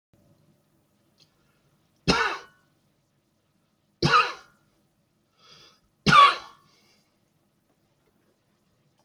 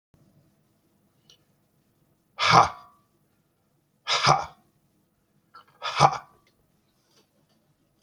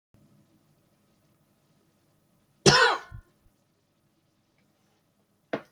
{"three_cough_length": "9.0 s", "three_cough_amplitude": 22055, "three_cough_signal_mean_std_ratio": 0.23, "exhalation_length": "8.0 s", "exhalation_amplitude": 27579, "exhalation_signal_mean_std_ratio": 0.25, "cough_length": "5.7 s", "cough_amplitude": 25219, "cough_signal_mean_std_ratio": 0.2, "survey_phase": "beta (2021-08-13 to 2022-03-07)", "age": "45-64", "gender": "Male", "wearing_mask": "No", "symptom_none": true, "smoker_status": "Ex-smoker", "respiratory_condition_asthma": false, "respiratory_condition_other": false, "recruitment_source": "REACT", "submission_delay": "2 days", "covid_test_result": "Negative", "covid_test_method": "RT-qPCR"}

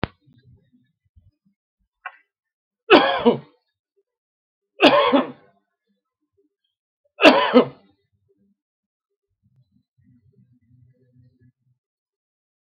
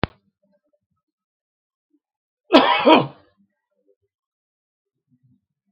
{"three_cough_length": "12.6 s", "three_cough_amplitude": 32768, "three_cough_signal_mean_std_ratio": 0.24, "cough_length": "5.7 s", "cough_amplitude": 32768, "cough_signal_mean_std_ratio": 0.22, "survey_phase": "beta (2021-08-13 to 2022-03-07)", "age": "65+", "gender": "Male", "wearing_mask": "No", "symptom_none": true, "smoker_status": "Never smoked", "respiratory_condition_asthma": false, "respiratory_condition_other": false, "recruitment_source": "REACT", "submission_delay": "2 days", "covid_test_result": "Negative", "covid_test_method": "RT-qPCR", "influenza_a_test_result": "Negative", "influenza_b_test_result": "Negative"}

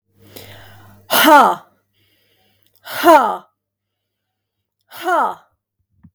{"exhalation_length": "6.1 s", "exhalation_amplitude": 32768, "exhalation_signal_mean_std_ratio": 0.34, "survey_phase": "beta (2021-08-13 to 2022-03-07)", "age": "45-64", "gender": "Female", "wearing_mask": "No", "symptom_none": true, "smoker_status": "Never smoked", "respiratory_condition_asthma": true, "respiratory_condition_other": false, "recruitment_source": "REACT", "submission_delay": "2 days", "covid_test_result": "Negative", "covid_test_method": "RT-qPCR", "influenza_a_test_result": "Negative", "influenza_b_test_result": "Negative"}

